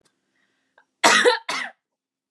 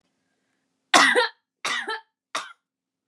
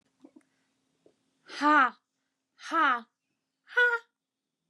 {"cough_length": "2.3 s", "cough_amplitude": 31655, "cough_signal_mean_std_ratio": 0.35, "three_cough_length": "3.1 s", "three_cough_amplitude": 31740, "three_cough_signal_mean_std_ratio": 0.33, "exhalation_length": "4.7 s", "exhalation_amplitude": 9497, "exhalation_signal_mean_std_ratio": 0.34, "survey_phase": "beta (2021-08-13 to 2022-03-07)", "age": "18-44", "gender": "Female", "wearing_mask": "No", "symptom_none": true, "smoker_status": "Never smoked", "respiratory_condition_asthma": false, "respiratory_condition_other": false, "recruitment_source": "REACT", "submission_delay": "3 days", "covid_test_result": "Negative", "covid_test_method": "RT-qPCR"}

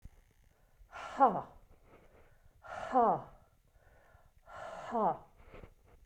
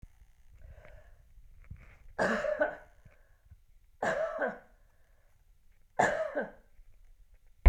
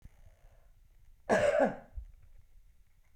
{"exhalation_length": "6.1 s", "exhalation_amplitude": 7603, "exhalation_signal_mean_std_ratio": 0.34, "three_cough_length": "7.7 s", "three_cough_amplitude": 13404, "three_cough_signal_mean_std_ratio": 0.34, "cough_length": "3.2 s", "cough_amplitude": 6037, "cough_signal_mean_std_ratio": 0.38, "survey_phase": "beta (2021-08-13 to 2022-03-07)", "age": "65+", "gender": "Female", "wearing_mask": "No", "symptom_none": true, "smoker_status": "Never smoked", "respiratory_condition_asthma": false, "respiratory_condition_other": false, "recruitment_source": "REACT", "submission_delay": "2 days", "covid_test_result": "Negative", "covid_test_method": "RT-qPCR"}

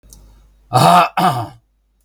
{"exhalation_length": "2.0 s", "exhalation_amplitude": 32768, "exhalation_signal_mean_std_ratio": 0.47, "survey_phase": "beta (2021-08-13 to 2022-03-07)", "age": "65+", "gender": "Male", "wearing_mask": "No", "symptom_none": true, "smoker_status": "Never smoked", "respiratory_condition_asthma": false, "respiratory_condition_other": true, "recruitment_source": "REACT", "submission_delay": "2 days", "covid_test_result": "Negative", "covid_test_method": "RT-qPCR", "influenza_a_test_result": "Negative", "influenza_b_test_result": "Negative"}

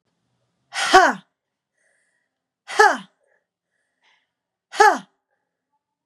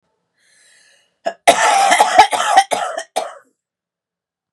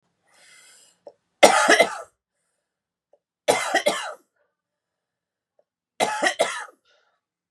{"exhalation_length": "6.1 s", "exhalation_amplitude": 32767, "exhalation_signal_mean_std_ratio": 0.25, "cough_length": "4.5 s", "cough_amplitude": 32768, "cough_signal_mean_std_ratio": 0.44, "three_cough_length": "7.5 s", "three_cough_amplitude": 32767, "three_cough_signal_mean_std_ratio": 0.31, "survey_phase": "beta (2021-08-13 to 2022-03-07)", "age": "18-44", "gender": "Female", "wearing_mask": "No", "symptom_cough_any": true, "symptom_new_continuous_cough": true, "symptom_runny_or_blocked_nose": true, "symptom_sore_throat": true, "symptom_fatigue": true, "symptom_fever_high_temperature": true, "symptom_headache": true, "symptom_change_to_sense_of_smell_or_taste": true, "symptom_onset": "4 days", "smoker_status": "Never smoked", "respiratory_condition_asthma": true, "respiratory_condition_other": false, "recruitment_source": "Test and Trace", "submission_delay": "2 days", "covid_test_result": "Positive", "covid_test_method": "ePCR"}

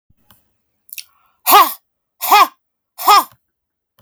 {"exhalation_length": "4.0 s", "exhalation_amplitude": 32768, "exhalation_signal_mean_std_ratio": 0.33, "survey_phase": "beta (2021-08-13 to 2022-03-07)", "age": "45-64", "gender": "Female", "wearing_mask": "No", "symptom_runny_or_blocked_nose": true, "symptom_sore_throat": true, "symptom_fatigue": true, "smoker_status": "Current smoker (11 or more cigarettes per day)", "respiratory_condition_asthma": false, "respiratory_condition_other": false, "recruitment_source": "REACT", "submission_delay": "3 days", "covid_test_result": "Negative", "covid_test_method": "RT-qPCR"}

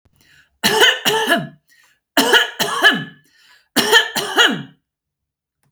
{"three_cough_length": "5.7 s", "three_cough_amplitude": 32768, "three_cough_signal_mean_std_ratio": 0.49, "survey_phase": "beta (2021-08-13 to 2022-03-07)", "age": "45-64", "gender": "Female", "wearing_mask": "No", "symptom_none": true, "smoker_status": "Never smoked", "respiratory_condition_asthma": false, "respiratory_condition_other": false, "recruitment_source": "REACT", "submission_delay": "2 days", "covid_test_result": "Negative", "covid_test_method": "RT-qPCR", "influenza_a_test_result": "Negative", "influenza_b_test_result": "Negative"}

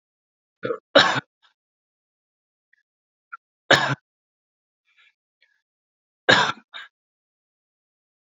{"three_cough_length": "8.4 s", "three_cough_amplitude": 29558, "three_cough_signal_mean_std_ratio": 0.22, "survey_phase": "beta (2021-08-13 to 2022-03-07)", "age": "18-44", "gender": "Male", "wearing_mask": "No", "symptom_none": true, "smoker_status": "Current smoker (1 to 10 cigarettes per day)", "respiratory_condition_asthma": false, "respiratory_condition_other": false, "recruitment_source": "REACT", "submission_delay": "1 day", "covid_test_result": "Negative", "covid_test_method": "RT-qPCR", "influenza_a_test_result": "Unknown/Void", "influenza_b_test_result": "Unknown/Void"}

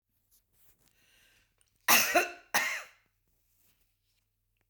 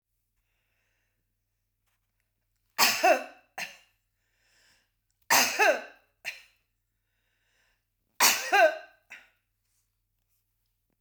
{"cough_length": "4.7 s", "cough_amplitude": 11028, "cough_signal_mean_std_ratio": 0.28, "three_cough_length": "11.0 s", "three_cough_amplitude": 14384, "three_cough_signal_mean_std_ratio": 0.28, "survey_phase": "beta (2021-08-13 to 2022-03-07)", "age": "65+", "gender": "Female", "wearing_mask": "No", "symptom_cough_any": true, "symptom_onset": "8 days", "smoker_status": "Never smoked", "respiratory_condition_asthma": false, "respiratory_condition_other": false, "recruitment_source": "REACT", "submission_delay": "1 day", "covid_test_result": "Negative", "covid_test_method": "RT-qPCR", "influenza_a_test_result": "Negative", "influenza_b_test_result": "Negative"}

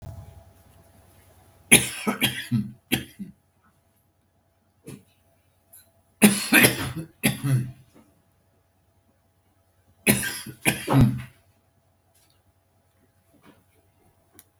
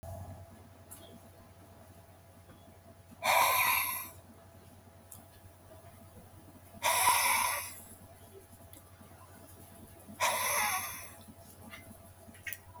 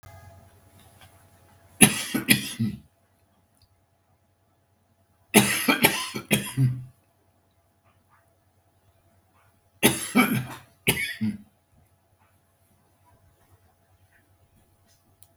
{"cough_length": "14.6 s", "cough_amplitude": 32768, "cough_signal_mean_std_ratio": 0.3, "exhalation_length": "12.8 s", "exhalation_amplitude": 7038, "exhalation_signal_mean_std_ratio": 0.46, "three_cough_length": "15.4 s", "three_cough_amplitude": 32766, "three_cough_signal_mean_std_ratio": 0.3, "survey_phase": "beta (2021-08-13 to 2022-03-07)", "age": "65+", "gender": "Male", "wearing_mask": "No", "symptom_none": true, "smoker_status": "Ex-smoker", "respiratory_condition_asthma": false, "respiratory_condition_other": false, "recruitment_source": "REACT", "submission_delay": "2 days", "covid_test_result": "Negative", "covid_test_method": "RT-qPCR"}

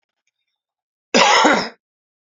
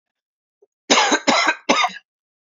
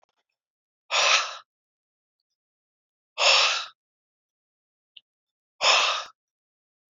{"cough_length": "2.4 s", "cough_amplitude": 29937, "cough_signal_mean_std_ratio": 0.38, "three_cough_length": "2.6 s", "three_cough_amplitude": 32767, "three_cough_signal_mean_std_ratio": 0.45, "exhalation_length": "6.9 s", "exhalation_amplitude": 15903, "exhalation_signal_mean_std_ratio": 0.33, "survey_phase": "beta (2021-08-13 to 2022-03-07)", "age": "65+", "gender": "Male", "wearing_mask": "No", "symptom_cough_any": true, "symptom_runny_or_blocked_nose": true, "symptom_fatigue": true, "symptom_headache": true, "symptom_change_to_sense_of_smell_or_taste": true, "symptom_loss_of_taste": true, "symptom_onset": "3 days", "smoker_status": "Never smoked", "respiratory_condition_asthma": false, "respiratory_condition_other": false, "recruitment_source": "Test and Trace", "submission_delay": "2 days", "covid_test_result": "Positive", "covid_test_method": "RT-qPCR"}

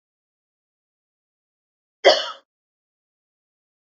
{"cough_length": "3.9 s", "cough_amplitude": 27587, "cough_signal_mean_std_ratio": 0.16, "survey_phase": "alpha (2021-03-01 to 2021-08-12)", "age": "45-64", "gender": "Female", "wearing_mask": "No", "symptom_none": true, "symptom_onset": "12 days", "smoker_status": "Ex-smoker", "respiratory_condition_asthma": false, "respiratory_condition_other": false, "recruitment_source": "REACT", "submission_delay": "4 days", "covid_test_result": "Negative", "covid_test_method": "RT-qPCR"}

